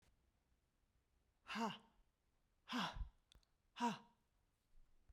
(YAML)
exhalation_length: 5.1 s
exhalation_amplitude: 1200
exhalation_signal_mean_std_ratio: 0.34
survey_phase: beta (2021-08-13 to 2022-03-07)
age: 45-64
gender: Female
wearing_mask: 'No'
symptom_none: true
smoker_status: Never smoked
respiratory_condition_asthma: false
respiratory_condition_other: false
recruitment_source: REACT
submission_delay: 1 day
covid_test_result: Negative
covid_test_method: RT-qPCR